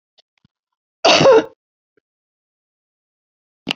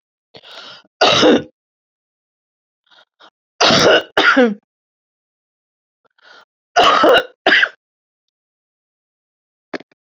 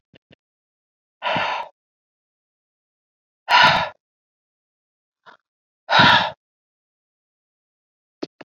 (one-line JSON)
{"cough_length": "3.8 s", "cough_amplitude": 30513, "cough_signal_mean_std_ratio": 0.27, "three_cough_length": "10.1 s", "three_cough_amplitude": 31576, "three_cough_signal_mean_std_ratio": 0.36, "exhalation_length": "8.4 s", "exhalation_amplitude": 30636, "exhalation_signal_mean_std_ratio": 0.27, "survey_phase": "beta (2021-08-13 to 2022-03-07)", "age": "65+", "gender": "Female", "wearing_mask": "No", "symptom_cough_any": true, "symptom_runny_or_blocked_nose": true, "symptom_abdominal_pain": true, "smoker_status": "Current smoker (1 to 10 cigarettes per day)", "respiratory_condition_asthma": false, "respiratory_condition_other": false, "recruitment_source": "Test and Trace", "submission_delay": "1 day", "covid_test_result": "Positive", "covid_test_method": "LFT"}